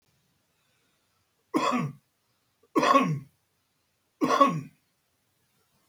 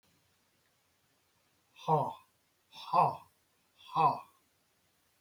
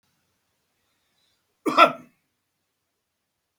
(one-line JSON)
{"three_cough_length": "5.9 s", "three_cough_amplitude": 17042, "three_cough_signal_mean_std_ratio": 0.34, "exhalation_length": "5.2 s", "exhalation_amplitude": 6191, "exhalation_signal_mean_std_ratio": 0.3, "cough_length": "3.6 s", "cough_amplitude": 32767, "cough_signal_mean_std_ratio": 0.18, "survey_phase": "beta (2021-08-13 to 2022-03-07)", "age": "65+", "gender": "Male", "wearing_mask": "No", "symptom_cough_any": true, "smoker_status": "Current smoker (e-cigarettes or vapes only)", "respiratory_condition_asthma": false, "respiratory_condition_other": false, "recruitment_source": "REACT", "submission_delay": "2 days", "covid_test_result": "Negative", "covid_test_method": "RT-qPCR", "influenza_a_test_result": "Negative", "influenza_b_test_result": "Negative"}